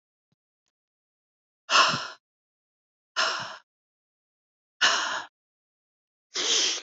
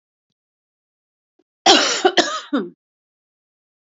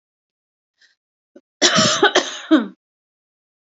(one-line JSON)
{"exhalation_length": "6.8 s", "exhalation_amplitude": 17888, "exhalation_signal_mean_std_ratio": 0.35, "cough_length": "3.9 s", "cough_amplitude": 30175, "cough_signal_mean_std_ratio": 0.32, "three_cough_length": "3.7 s", "three_cough_amplitude": 29855, "three_cough_signal_mean_std_ratio": 0.36, "survey_phase": "alpha (2021-03-01 to 2021-08-12)", "age": "45-64", "gender": "Female", "wearing_mask": "No", "symptom_cough_any": true, "symptom_shortness_of_breath": true, "symptom_fatigue": true, "symptom_change_to_sense_of_smell_or_taste": true, "smoker_status": "Never smoked", "respiratory_condition_asthma": false, "respiratory_condition_other": false, "recruitment_source": "REACT", "submission_delay": "1 day", "covid_test_result": "Negative", "covid_test_method": "RT-qPCR"}